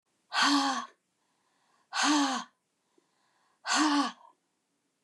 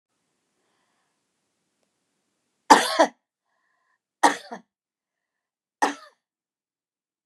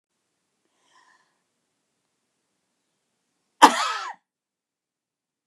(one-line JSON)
{"exhalation_length": "5.0 s", "exhalation_amplitude": 7908, "exhalation_signal_mean_std_ratio": 0.45, "three_cough_length": "7.3 s", "three_cough_amplitude": 29203, "three_cough_signal_mean_std_ratio": 0.18, "cough_length": "5.5 s", "cough_amplitude": 29204, "cough_signal_mean_std_ratio": 0.15, "survey_phase": "beta (2021-08-13 to 2022-03-07)", "age": "65+", "gender": "Female", "wearing_mask": "No", "symptom_none": true, "smoker_status": "Ex-smoker", "respiratory_condition_asthma": false, "respiratory_condition_other": false, "recruitment_source": "REACT", "submission_delay": "3 days", "covid_test_result": "Negative", "covid_test_method": "RT-qPCR", "influenza_a_test_result": "Negative", "influenza_b_test_result": "Negative"}